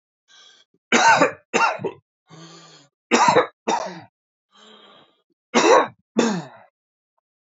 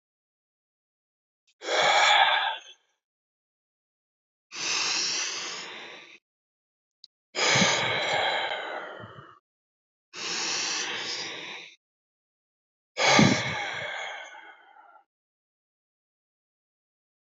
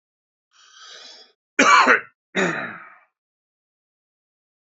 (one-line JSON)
{"three_cough_length": "7.5 s", "three_cough_amplitude": 27676, "three_cough_signal_mean_std_ratio": 0.39, "exhalation_length": "17.3 s", "exhalation_amplitude": 16202, "exhalation_signal_mean_std_ratio": 0.44, "cough_length": "4.6 s", "cough_amplitude": 28201, "cough_signal_mean_std_ratio": 0.3, "survey_phase": "beta (2021-08-13 to 2022-03-07)", "age": "18-44", "gender": "Male", "wearing_mask": "No", "symptom_none": true, "symptom_onset": "12 days", "smoker_status": "Never smoked", "respiratory_condition_asthma": false, "respiratory_condition_other": false, "recruitment_source": "REACT", "submission_delay": "5 days", "covid_test_result": "Negative", "covid_test_method": "RT-qPCR", "influenza_a_test_result": "Negative", "influenza_b_test_result": "Negative"}